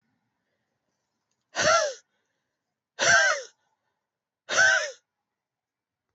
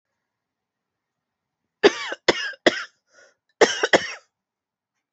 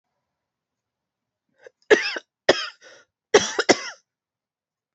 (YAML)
exhalation_length: 6.1 s
exhalation_amplitude: 13377
exhalation_signal_mean_std_ratio: 0.35
cough_length: 5.1 s
cough_amplitude: 29757
cough_signal_mean_std_ratio: 0.25
three_cough_length: 4.9 s
three_cough_amplitude: 31490
three_cough_signal_mean_std_ratio: 0.24
survey_phase: alpha (2021-03-01 to 2021-08-12)
age: 18-44
gender: Female
wearing_mask: 'No'
symptom_cough_any: true
symptom_diarrhoea: true
symptom_fatigue: true
symptom_headache: true
symptom_onset: 4 days
smoker_status: Never smoked
respiratory_condition_asthma: false
respiratory_condition_other: false
recruitment_source: Test and Trace
submission_delay: 2 days
covid_test_result: Positive
covid_test_method: RT-qPCR
covid_ct_value: 17.0
covid_ct_gene: N gene
covid_ct_mean: 17.7
covid_viral_load: 1600000 copies/ml
covid_viral_load_category: High viral load (>1M copies/ml)